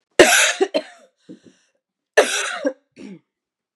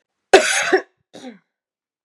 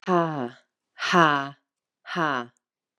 {"three_cough_length": "3.8 s", "three_cough_amplitude": 32768, "three_cough_signal_mean_std_ratio": 0.36, "cough_length": "2.0 s", "cough_amplitude": 32768, "cough_signal_mean_std_ratio": 0.33, "exhalation_length": "3.0 s", "exhalation_amplitude": 20975, "exhalation_signal_mean_std_ratio": 0.43, "survey_phase": "beta (2021-08-13 to 2022-03-07)", "age": "18-44", "gender": "Female", "wearing_mask": "No", "symptom_cough_any": true, "symptom_runny_or_blocked_nose": true, "symptom_change_to_sense_of_smell_or_taste": true, "symptom_loss_of_taste": true, "symptom_onset": "4 days", "smoker_status": "Never smoked", "respiratory_condition_asthma": false, "respiratory_condition_other": false, "recruitment_source": "Test and Trace", "submission_delay": "2 days", "covid_test_result": "Positive", "covid_test_method": "RT-qPCR", "covid_ct_value": 27.8, "covid_ct_gene": "N gene"}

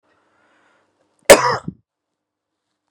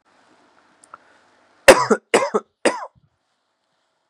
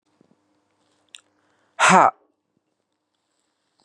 {"cough_length": "2.9 s", "cough_amplitude": 32768, "cough_signal_mean_std_ratio": 0.2, "three_cough_length": "4.1 s", "three_cough_amplitude": 32768, "three_cough_signal_mean_std_ratio": 0.24, "exhalation_length": "3.8 s", "exhalation_amplitude": 31732, "exhalation_signal_mean_std_ratio": 0.21, "survey_phase": "beta (2021-08-13 to 2022-03-07)", "age": "18-44", "gender": "Male", "wearing_mask": "No", "symptom_cough_any": true, "symptom_onset": "3 days", "smoker_status": "Never smoked", "respiratory_condition_asthma": true, "respiratory_condition_other": false, "recruitment_source": "Test and Trace", "submission_delay": "2 days", "covid_test_result": "Positive", "covid_test_method": "RT-qPCR", "covid_ct_value": 18.3, "covid_ct_gene": "ORF1ab gene", "covid_ct_mean": 18.5, "covid_viral_load": "860000 copies/ml", "covid_viral_load_category": "Low viral load (10K-1M copies/ml)"}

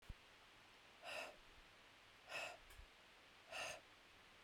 {"exhalation_length": "4.4 s", "exhalation_amplitude": 522, "exhalation_signal_mean_std_ratio": 0.64, "survey_phase": "beta (2021-08-13 to 2022-03-07)", "age": "45-64", "gender": "Female", "wearing_mask": "No", "symptom_runny_or_blocked_nose": true, "symptom_abdominal_pain": true, "symptom_diarrhoea": true, "symptom_fatigue": true, "symptom_onset": "12 days", "smoker_status": "Ex-smoker", "respiratory_condition_asthma": true, "respiratory_condition_other": false, "recruitment_source": "REACT", "submission_delay": "1 day", "covid_test_result": "Negative", "covid_test_method": "RT-qPCR", "influenza_a_test_result": "Negative", "influenza_b_test_result": "Negative"}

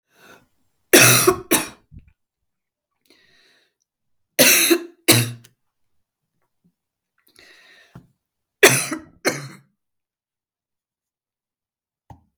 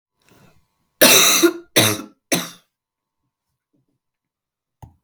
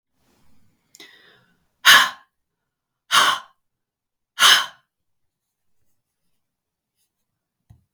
{"three_cough_length": "12.4 s", "three_cough_amplitude": 32768, "three_cough_signal_mean_std_ratio": 0.27, "cough_length": "5.0 s", "cough_amplitude": 32768, "cough_signal_mean_std_ratio": 0.32, "exhalation_length": "7.9 s", "exhalation_amplitude": 32768, "exhalation_signal_mean_std_ratio": 0.23, "survey_phase": "beta (2021-08-13 to 2022-03-07)", "age": "45-64", "gender": "Female", "wearing_mask": "No", "symptom_cough_any": true, "symptom_runny_or_blocked_nose": true, "symptom_sore_throat": true, "symptom_fatigue": true, "symptom_onset": "2 days", "smoker_status": "Never smoked", "respiratory_condition_asthma": false, "respiratory_condition_other": false, "recruitment_source": "Test and Trace", "submission_delay": "1 day", "covid_test_result": "Positive", "covid_test_method": "RT-qPCR", "covid_ct_value": 34.9, "covid_ct_gene": "N gene"}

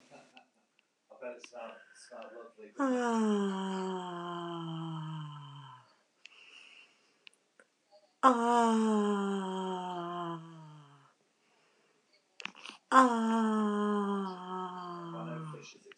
{"exhalation_length": "16.0 s", "exhalation_amplitude": 12525, "exhalation_signal_mean_std_ratio": 0.53, "survey_phase": "beta (2021-08-13 to 2022-03-07)", "age": "45-64", "gender": "Female", "wearing_mask": "No", "symptom_none": true, "smoker_status": "Current smoker (1 to 10 cigarettes per day)", "respiratory_condition_asthma": false, "respiratory_condition_other": false, "recruitment_source": "REACT", "submission_delay": "2 days", "covid_test_result": "Negative", "covid_test_method": "RT-qPCR", "influenza_a_test_result": "Negative", "influenza_b_test_result": "Negative"}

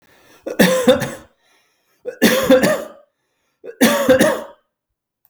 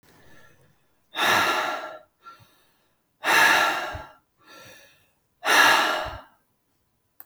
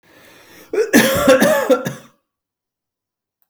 {"three_cough_length": "5.3 s", "three_cough_amplitude": 32768, "three_cough_signal_mean_std_ratio": 0.47, "exhalation_length": "7.3 s", "exhalation_amplitude": 20610, "exhalation_signal_mean_std_ratio": 0.43, "cough_length": "3.5 s", "cough_amplitude": 32768, "cough_signal_mean_std_ratio": 0.46, "survey_phase": "beta (2021-08-13 to 2022-03-07)", "age": "45-64", "gender": "Male", "wearing_mask": "No", "symptom_runny_or_blocked_nose": true, "symptom_headache": true, "symptom_onset": "12 days", "smoker_status": "Never smoked", "respiratory_condition_asthma": false, "respiratory_condition_other": false, "recruitment_source": "REACT", "submission_delay": "1 day", "covid_test_result": "Negative", "covid_test_method": "RT-qPCR", "influenza_a_test_result": "Negative", "influenza_b_test_result": "Negative"}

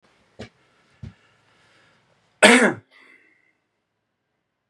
{"cough_length": "4.7 s", "cough_amplitude": 32326, "cough_signal_mean_std_ratio": 0.21, "survey_phase": "beta (2021-08-13 to 2022-03-07)", "age": "18-44", "gender": "Male", "wearing_mask": "No", "symptom_none": true, "smoker_status": "Never smoked", "respiratory_condition_asthma": false, "respiratory_condition_other": false, "recruitment_source": "REACT", "submission_delay": "1 day", "covid_test_result": "Negative", "covid_test_method": "RT-qPCR", "influenza_a_test_result": "Negative", "influenza_b_test_result": "Negative"}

